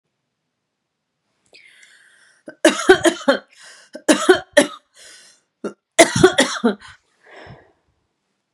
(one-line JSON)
{"three_cough_length": "8.5 s", "three_cough_amplitude": 32768, "three_cough_signal_mean_std_ratio": 0.3, "survey_phase": "beta (2021-08-13 to 2022-03-07)", "age": "18-44", "gender": "Female", "wearing_mask": "No", "symptom_runny_or_blocked_nose": true, "symptom_shortness_of_breath": true, "smoker_status": "Ex-smoker", "respiratory_condition_asthma": false, "respiratory_condition_other": false, "recruitment_source": "Test and Trace", "submission_delay": "2 days", "covid_test_result": "Positive", "covid_test_method": "ePCR"}